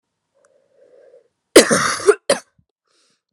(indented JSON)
{
  "cough_length": "3.3 s",
  "cough_amplitude": 32768,
  "cough_signal_mean_std_ratio": 0.28,
  "survey_phase": "alpha (2021-03-01 to 2021-08-12)",
  "age": "18-44",
  "gender": "Female",
  "wearing_mask": "No",
  "symptom_cough_any": true,
  "symptom_new_continuous_cough": true,
  "symptom_abdominal_pain": true,
  "symptom_diarrhoea": true,
  "symptom_fatigue": true,
  "symptom_headache": true,
  "symptom_change_to_sense_of_smell_or_taste": true,
  "symptom_onset": "3 days",
  "smoker_status": "Never smoked",
  "respiratory_condition_asthma": false,
  "respiratory_condition_other": false,
  "recruitment_source": "Test and Trace",
  "submission_delay": "2 days",
  "covid_test_result": "Positive",
  "covid_test_method": "RT-qPCR",
  "covid_ct_value": 13.7,
  "covid_ct_gene": "ORF1ab gene",
  "covid_ct_mean": 14.0,
  "covid_viral_load": "25000000 copies/ml",
  "covid_viral_load_category": "High viral load (>1M copies/ml)"
}